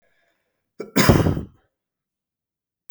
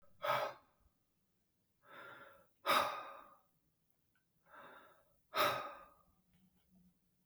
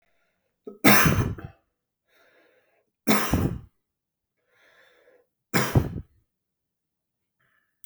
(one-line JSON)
{"cough_length": "2.9 s", "cough_amplitude": 32768, "cough_signal_mean_std_ratio": 0.3, "exhalation_length": "7.3 s", "exhalation_amplitude": 3356, "exhalation_signal_mean_std_ratio": 0.33, "three_cough_length": "7.9 s", "three_cough_amplitude": 32189, "three_cough_signal_mean_std_ratio": 0.3, "survey_phase": "beta (2021-08-13 to 2022-03-07)", "age": "45-64", "gender": "Male", "wearing_mask": "No", "symptom_cough_any": true, "symptom_runny_or_blocked_nose": true, "symptom_sore_throat": true, "symptom_fatigue": true, "smoker_status": "Ex-smoker", "respiratory_condition_asthma": false, "respiratory_condition_other": false, "recruitment_source": "Test and Trace", "submission_delay": "2 days", "covid_test_result": "Positive", "covid_test_method": "RT-qPCR", "covid_ct_value": 19.4, "covid_ct_gene": "ORF1ab gene"}